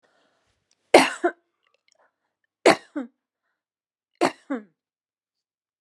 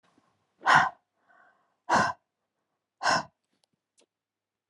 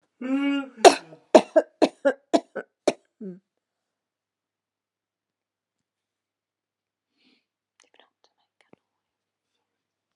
{
  "three_cough_length": "5.8 s",
  "three_cough_amplitude": 32767,
  "three_cough_signal_mean_std_ratio": 0.2,
  "exhalation_length": "4.7 s",
  "exhalation_amplitude": 15338,
  "exhalation_signal_mean_std_ratio": 0.29,
  "cough_length": "10.2 s",
  "cough_amplitude": 32767,
  "cough_signal_mean_std_ratio": 0.19,
  "survey_phase": "alpha (2021-03-01 to 2021-08-12)",
  "age": "65+",
  "gender": "Female",
  "wearing_mask": "No",
  "symptom_none": true,
  "smoker_status": "Never smoked",
  "respiratory_condition_asthma": false,
  "respiratory_condition_other": false,
  "recruitment_source": "REACT",
  "submission_delay": "2 days",
  "covid_test_result": "Negative",
  "covid_test_method": "RT-qPCR"
}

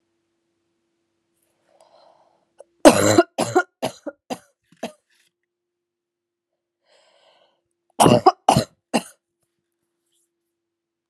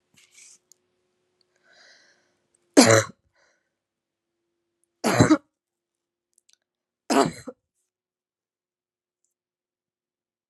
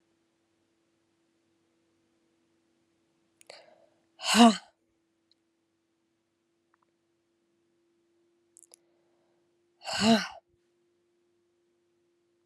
{
  "cough_length": "11.1 s",
  "cough_amplitude": 32768,
  "cough_signal_mean_std_ratio": 0.23,
  "three_cough_length": "10.5 s",
  "three_cough_amplitude": 29807,
  "three_cough_signal_mean_std_ratio": 0.2,
  "exhalation_length": "12.5 s",
  "exhalation_amplitude": 19649,
  "exhalation_signal_mean_std_ratio": 0.17,
  "survey_phase": "alpha (2021-03-01 to 2021-08-12)",
  "age": "18-44",
  "gender": "Female",
  "wearing_mask": "No",
  "symptom_cough_any": true,
  "symptom_fatigue": true,
  "symptom_fever_high_temperature": true,
  "symptom_headache": true,
  "symptom_change_to_sense_of_smell_or_taste": true,
  "symptom_loss_of_taste": true,
  "symptom_onset": "3 days",
  "smoker_status": "Never smoked",
  "respiratory_condition_asthma": false,
  "respiratory_condition_other": false,
  "recruitment_source": "Test and Trace",
  "submission_delay": "1 day",
  "covid_test_result": "Positive",
  "covid_test_method": "RT-qPCR",
  "covid_ct_value": 25.2,
  "covid_ct_gene": "ORF1ab gene"
}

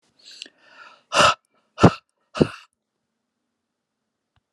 {
  "exhalation_length": "4.5 s",
  "exhalation_amplitude": 32768,
  "exhalation_signal_mean_std_ratio": 0.22,
  "survey_phase": "alpha (2021-03-01 to 2021-08-12)",
  "age": "45-64",
  "gender": "Male",
  "wearing_mask": "No",
  "symptom_none": true,
  "smoker_status": "Never smoked",
  "respiratory_condition_asthma": false,
  "respiratory_condition_other": false,
  "recruitment_source": "REACT",
  "submission_delay": "2 days",
  "covid_test_result": "Negative",
  "covid_test_method": "RT-qPCR"
}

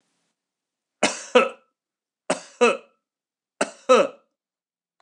{
  "three_cough_length": "5.0 s",
  "three_cough_amplitude": 24939,
  "three_cough_signal_mean_std_ratio": 0.28,
  "survey_phase": "beta (2021-08-13 to 2022-03-07)",
  "age": "45-64",
  "gender": "Male",
  "wearing_mask": "No",
  "symptom_none": true,
  "smoker_status": "Never smoked",
  "respiratory_condition_asthma": false,
  "respiratory_condition_other": false,
  "recruitment_source": "REACT",
  "submission_delay": "1 day",
  "covid_test_result": "Negative",
  "covid_test_method": "RT-qPCR",
  "influenza_a_test_result": "Negative",
  "influenza_b_test_result": "Negative"
}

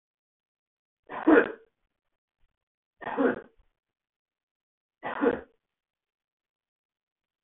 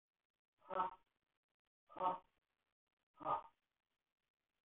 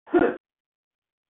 {
  "three_cough_length": "7.4 s",
  "three_cough_amplitude": 15208,
  "three_cough_signal_mean_std_ratio": 0.23,
  "exhalation_length": "4.6 s",
  "exhalation_amplitude": 1717,
  "exhalation_signal_mean_std_ratio": 0.27,
  "cough_length": "1.3 s",
  "cough_amplitude": 11916,
  "cough_signal_mean_std_ratio": 0.31,
  "survey_phase": "beta (2021-08-13 to 2022-03-07)",
  "age": "45-64",
  "gender": "Male",
  "wearing_mask": "No",
  "symptom_none": true,
  "symptom_onset": "6 days",
  "smoker_status": "Ex-smoker",
  "respiratory_condition_asthma": false,
  "respiratory_condition_other": false,
  "recruitment_source": "REACT",
  "submission_delay": "8 days",
  "covid_test_result": "Negative",
  "covid_test_method": "RT-qPCR",
  "influenza_a_test_result": "Negative",
  "influenza_b_test_result": "Negative"
}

